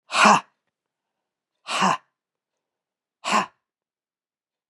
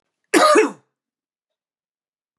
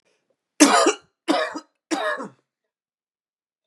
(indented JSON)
{
  "exhalation_length": "4.7 s",
  "exhalation_amplitude": 27966,
  "exhalation_signal_mean_std_ratio": 0.29,
  "cough_length": "2.4 s",
  "cough_amplitude": 24530,
  "cough_signal_mean_std_ratio": 0.32,
  "three_cough_length": "3.7 s",
  "three_cough_amplitude": 32768,
  "three_cough_signal_mean_std_ratio": 0.35,
  "survey_phase": "beta (2021-08-13 to 2022-03-07)",
  "age": "45-64",
  "gender": "Male",
  "wearing_mask": "No",
  "symptom_cough_any": true,
  "symptom_runny_or_blocked_nose": true,
  "symptom_onset": "3 days",
  "smoker_status": "Ex-smoker",
  "respiratory_condition_asthma": false,
  "respiratory_condition_other": false,
  "recruitment_source": "Test and Trace",
  "submission_delay": "1 day",
  "covid_test_result": "Positive",
  "covid_test_method": "RT-qPCR",
  "covid_ct_value": 17.8,
  "covid_ct_gene": "ORF1ab gene",
  "covid_ct_mean": 18.2,
  "covid_viral_load": "1100000 copies/ml",
  "covid_viral_load_category": "High viral load (>1M copies/ml)"
}